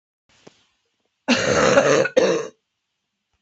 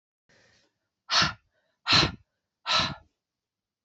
{"cough_length": "3.4 s", "cough_amplitude": 27646, "cough_signal_mean_std_ratio": 0.47, "exhalation_length": "3.8 s", "exhalation_amplitude": 13005, "exhalation_signal_mean_std_ratio": 0.33, "survey_phase": "beta (2021-08-13 to 2022-03-07)", "age": "45-64", "gender": "Female", "wearing_mask": "No", "symptom_cough_any": true, "symptom_new_continuous_cough": true, "symptom_runny_or_blocked_nose": true, "symptom_sore_throat": true, "symptom_fatigue": true, "symptom_fever_high_temperature": true, "symptom_headache": true, "symptom_change_to_sense_of_smell_or_taste": true, "symptom_onset": "6 days", "smoker_status": "Never smoked", "respiratory_condition_asthma": false, "respiratory_condition_other": false, "recruitment_source": "Test and Trace", "submission_delay": "2 days", "covid_test_result": "Positive", "covid_test_method": "LAMP"}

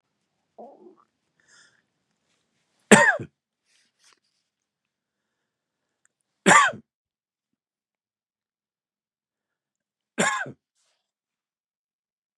{"three_cough_length": "12.4 s", "three_cough_amplitude": 32768, "three_cough_signal_mean_std_ratio": 0.18, "survey_phase": "beta (2021-08-13 to 2022-03-07)", "age": "65+", "gender": "Male", "wearing_mask": "No", "symptom_cough_any": true, "symptom_onset": "6 days", "smoker_status": "Never smoked", "respiratory_condition_asthma": false, "respiratory_condition_other": false, "recruitment_source": "REACT", "submission_delay": "1 day", "covid_test_result": "Positive", "covid_test_method": "RT-qPCR", "covid_ct_value": 22.5, "covid_ct_gene": "E gene", "influenza_a_test_result": "Negative", "influenza_b_test_result": "Negative"}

